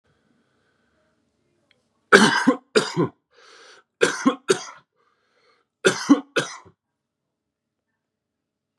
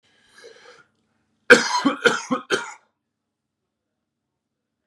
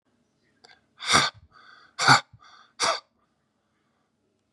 {
  "three_cough_length": "8.8 s",
  "three_cough_amplitude": 32768,
  "three_cough_signal_mean_std_ratio": 0.28,
  "cough_length": "4.9 s",
  "cough_amplitude": 32768,
  "cough_signal_mean_std_ratio": 0.26,
  "exhalation_length": "4.5 s",
  "exhalation_amplitude": 26229,
  "exhalation_signal_mean_std_ratio": 0.28,
  "survey_phase": "beta (2021-08-13 to 2022-03-07)",
  "age": "18-44",
  "gender": "Male",
  "wearing_mask": "No",
  "symptom_cough_any": true,
  "symptom_runny_or_blocked_nose": true,
  "symptom_sore_throat": true,
  "symptom_onset": "5 days",
  "smoker_status": "Ex-smoker",
  "respiratory_condition_asthma": false,
  "respiratory_condition_other": false,
  "recruitment_source": "Test and Trace",
  "submission_delay": "2 days",
  "covid_test_result": "Positive",
  "covid_test_method": "ePCR"
}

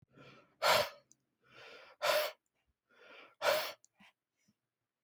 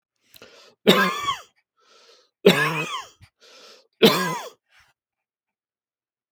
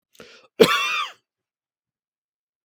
{
  "exhalation_length": "5.0 s",
  "exhalation_amplitude": 5788,
  "exhalation_signal_mean_std_ratio": 0.34,
  "three_cough_length": "6.3 s",
  "three_cough_amplitude": 32286,
  "three_cough_signal_mean_std_ratio": 0.32,
  "cough_length": "2.6 s",
  "cough_amplitude": 32766,
  "cough_signal_mean_std_ratio": 0.28,
  "survey_phase": "beta (2021-08-13 to 2022-03-07)",
  "age": "45-64",
  "gender": "Male",
  "wearing_mask": "No",
  "symptom_none": true,
  "smoker_status": "Never smoked",
  "respiratory_condition_asthma": false,
  "respiratory_condition_other": false,
  "recruitment_source": "REACT",
  "submission_delay": "3 days",
  "covid_test_result": "Negative",
  "covid_test_method": "RT-qPCR",
  "influenza_a_test_result": "Negative",
  "influenza_b_test_result": "Negative"
}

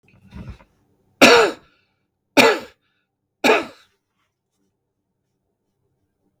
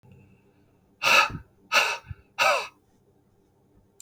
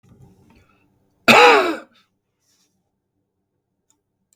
{
  "three_cough_length": "6.4 s",
  "three_cough_amplitude": 32768,
  "three_cough_signal_mean_std_ratio": 0.26,
  "exhalation_length": "4.0 s",
  "exhalation_amplitude": 17374,
  "exhalation_signal_mean_std_ratio": 0.36,
  "cough_length": "4.4 s",
  "cough_amplitude": 32768,
  "cough_signal_mean_std_ratio": 0.26,
  "survey_phase": "beta (2021-08-13 to 2022-03-07)",
  "age": "45-64",
  "gender": "Male",
  "wearing_mask": "No",
  "symptom_none": true,
  "symptom_onset": "12 days",
  "smoker_status": "Never smoked",
  "respiratory_condition_asthma": false,
  "respiratory_condition_other": false,
  "recruitment_source": "REACT",
  "submission_delay": "3 days",
  "covid_test_result": "Negative",
  "covid_test_method": "RT-qPCR",
  "influenza_a_test_result": "Unknown/Void",
  "influenza_b_test_result": "Unknown/Void"
}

